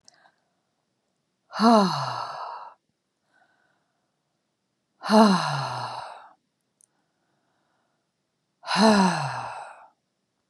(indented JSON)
{
  "exhalation_length": "10.5 s",
  "exhalation_amplitude": 20472,
  "exhalation_signal_mean_std_ratio": 0.34,
  "survey_phase": "beta (2021-08-13 to 2022-03-07)",
  "age": "65+",
  "gender": "Female",
  "wearing_mask": "No",
  "symptom_none": true,
  "smoker_status": "Never smoked",
  "respiratory_condition_asthma": false,
  "respiratory_condition_other": false,
  "recruitment_source": "REACT",
  "submission_delay": "1 day",
  "covid_test_result": "Negative",
  "covid_test_method": "RT-qPCR"
}